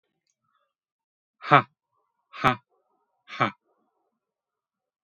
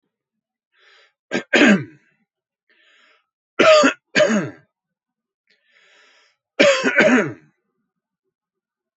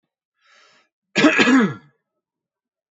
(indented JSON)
{
  "exhalation_length": "5.0 s",
  "exhalation_amplitude": 26181,
  "exhalation_signal_mean_std_ratio": 0.18,
  "three_cough_length": "9.0 s",
  "three_cough_amplitude": 29412,
  "three_cough_signal_mean_std_ratio": 0.35,
  "cough_length": "3.0 s",
  "cough_amplitude": 28545,
  "cough_signal_mean_std_ratio": 0.36,
  "survey_phase": "beta (2021-08-13 to 2022-03-07)",
  "age": "18-44",
  "gender": "Male",
  "wearing_mask": "No",
  "symptom_none": true,
  "smoker_status": "Ex-smoker",
  "respiratory_condition_asthma": false,
  "respiratory_condition_other": false,
  "recruitment_source": "Test and Trace",
  "submission_delay": "1 day",
  "covid_test_result": "Negative",
  "covid_test_method": "RT-qPCR"
}